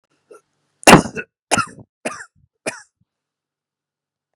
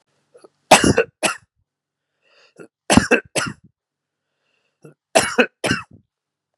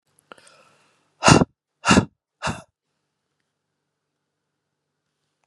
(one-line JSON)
{"cough_length": "4.4 s", "cough_amplitude": 32768, "cough_signal_mean_std_ratio": 0.21, "three_cough_length": "6.6 s", "three_cough_amplitude": 32768, "three_cough_signal_mean_std_ratio": 0.29, "exhalation_length": "5.5 s", "exhalation_amplitude": 32645, "exhalation_signal_mean_std_ratio": 0.21, "survey_phase": "beta (2021-08-13 to 2022-03-07)", "age": "18-44", "gender": "Male", "wearing_mask": "No", "symptom_none": true, "smoker_status": "Never smoked", "respiratory_condition_asthma": false, "respiratory_condition_other": false, "recruitment_source": "REACT", "submission_delay": "1 day", "covid_test_result": "Negative", "covid_test_method": "RT-qPCR"}